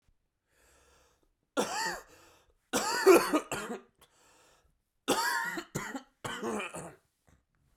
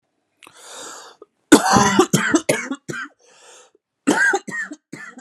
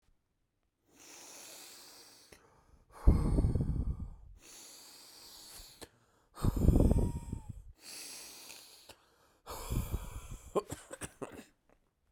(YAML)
three_cough_length: 7.8 s
three_cough_amplitude: 13588
three_cough_signal_mean_std_ratio: 0.37
cough_length: 5.2 s
cough_amplitude: 32768
cough_signal_mean_std_ratio: 0.43
exhalation_length: 12.1 s
exhalation_amplitude: 10187
exhalation_signal_mean_std_ratio: 0.38
survey_phase: beta (2021-08-13 to 2022-03-07)
age: 18-44
gender: Male
wearing_mask: 'No'
symptom_cough_any: true
symptom_runny_or_blocked_nose: true
symptom_sore_throat: true
symptom_diarrhoea: true
symptom_fatigue: true
symptom_headache: true
symptom_onset: 6 days
smoker_status: Never smoked
respiratory_condition_asthma: false
respiratory_condition_other: false
recruitment_source: Test and Trace
submission_delay: 2 days
covid_test_result: Positive
covid_test_method: RT-qPCR
covid_ct_value: 15.0
covid_ct_gene: ORF1ab gene
covid_ct_mean: 15.2
covid_viral_load: 10000000 copies/ml
covid_viral_load_category: High viral load (>1M copies/ml)